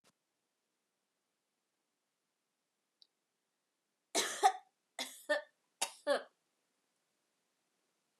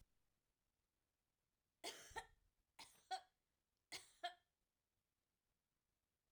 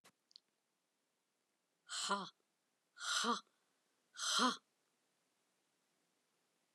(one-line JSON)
{"cough_length": "8.2 s", "cough_amplitude": 5339, "cough_signal_mean_std_ratio": 0.22, "three_cough_length": "6.3 s", "three_cough_amplitude": 551, "three_cough_signal_mean_std_ratio": 0.26, "exhalation_length": "6.7 s", "exhalation_amplitude": 2476, "exhalation_signal_mean_std_ratio": 0.32, "survey_phase": "alpha (2021-03-01 to 2021-08-12)", "age": "45-64", "gender": "Female", "wearing_mask": "No", "symptom_cough_any": true, "symptom_headache": true, "symptom_onset": "3 days", "smoker_status": "Never smoked", "respiratory_condition_asthma": false, "respiratory_condition_other": false, "recruitment_source": "Test and Trace", "submission_delay": "2 days", "covid_test_result": "Positive", "covid_test_method": "RT-qPCR"}